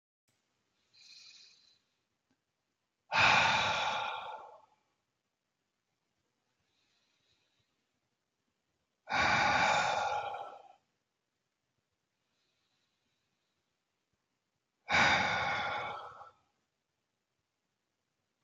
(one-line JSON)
{"exhalation_length": "18.4 s", "exhalation_amplitude": 6802, "exhalation_signal_mean_std_ratio": 0.35, "survey_phase": "beta (2021-08-13 to 2022-03-07)", "age": "18-44", "gender": "Male", "wearing_mask": "No", "symptom_none": true, "smoker_status": "Never smoked", "respiratory_condition_asthma": false, "respiratory_condition_other": false, "recruitment_source": "REACT", "submission_delay": "1 day", "covid_test_result": "Negative", "covid_test_method": "RT-qPCR", "influenza_a_test_result": "Negative", "influenza_b_test_result": "Negative"}